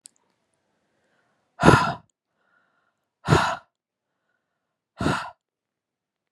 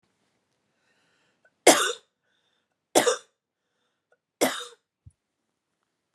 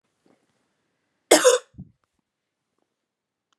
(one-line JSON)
{"exhalation_length": "6.3 s", "exhalation_amplitude": 32767, "exhalation_signal_mean_std_ratio": 0.25, "three_cough_length": "6.1 s", "three_cough_amplitude": 29635, "three_cough_signal_mean_std_ratio": 0.22, "cough_length": "3.6 s", "cough_amplitude": 32766, "cough_signal_mean_std_ratio": 0.2, "survey_phase": "beta (2021-08-13 to 2022-03-07)", "age": "45-64", "gender": "Female", "wearing_mask": "No", "symptom_runny_or_blocked_nose": true, "symptom_sore_throat": true, "smoker_status": "Ex-smoker", "respiratory_condition_asthma": false, "respiratory_condition_other": false, "recruitment_source": "Test and Trace", "submission_delay": "1 day", "covid_test_result": "Positive", "covid_test_method": "RT-qPCR", "covid_ct_value": 15.4, "covid_ct_gene": "ORF1ab gene"}